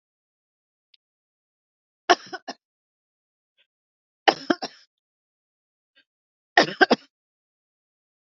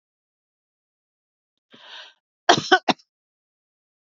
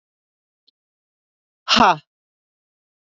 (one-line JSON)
{"three_cough_length": "8.3 s", "three_cough_amplitude": 28086, "three_cough_signal_mean_std_ratio": 0.16, "cough_length": "4.0 s", "cough_amplitude": 29403, "cough_signal_mean_std_ratio": 0.18, "exhalation_length": "3.1 s", "exhalation_amplitude": 27640, "exhalation_signal_mean_std_ratio": 0.22, "survey_phase": "beta (2021-08-13 to 2022-03-07)", "age": "45-64", "gender": "Female", "wearing_mask": "No", "symptom_none": true, "smoker_status": "Never smoked", "respiratory_condition_asthma": false, "respiratory_condition_other": false, "recruitment_source": "REACT", "submission_delay": "1 day", "covid_test_result": "Negative", "covid_test_method": "RT-qPCR", "influenza_a_test_result": "Negative", "influenza_b_test_result": "Negative"}